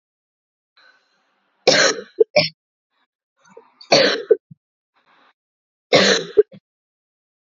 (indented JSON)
{
  "three_cough_length": "7.6 s",
  "three_cough_amplitude": 29780,
  "three_cough_signal_mean_std_ratio": 0.3,
  "survey_phase": "alpha (2021-03-01 to 2021-08-12)",
  "age": "18-44",
  "gender": "Female",
  "wearing_mask": "No",
  "symptom_cough_any": true,
  "symptom_fever_high_temperature": true,
  "symptom_headache": true,
  "symptom_change_to_sense_of_smell_or_taste": true,
  "symptom_loss_of_taste": true,
  "symptom_onset": "3 days",
  "smoker_status": "Never smoked",
  "respiratory_condition_asthma": false,
  "respiratory_condition_other": false,
  "recruitment_source": "Test and Trace",
  "submission_delay": "1 day",
  "covid_test_result": "Positive",
  "covid_test_method": "RT-qPCR"
}